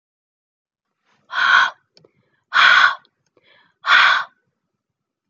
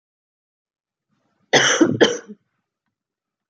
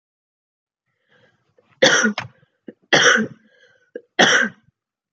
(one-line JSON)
{"exhalation_length": "5.3 s", "exhalation_amplitude": 30775, "exhalation_signal_mean_std_ratio": 0.38, "cough_length": "3.5 s", "cough_amplitude": 31954, "cough_signal_mean_std_ratio": 0.31, "three_cough_length": "5.1 s", "three_cough_amplitude": 30540, "three_cough_signal_mean_std_ratio": 0.35, "survey_phase": "beta (2021-08-13 to 2022-03-07)", "age": "18-44", "gender": "Female", "wearing_mask": "No", "symptom_cough_any": true, "symptom_runny_or_blocked_nose": true, "symptom_fatigue": true, "symptom_headache": true, "symptom_change_to_sense_of_smell_or_taste": true, "symptom_loss_of_taste": true, "symptom_onset": "3 days", "smoker_status": "Never smoked", "respiratory_condition_asthma": false, "respiratory_condition_other": false, "recruitment_source": "Test and Trace", "submission_delay": "1 day", "covid_test_result": "Positive", "covid_test_method": "RT-qPCR", "covid_ct_value": 24.1, "covid_ct_gene": "N gene"}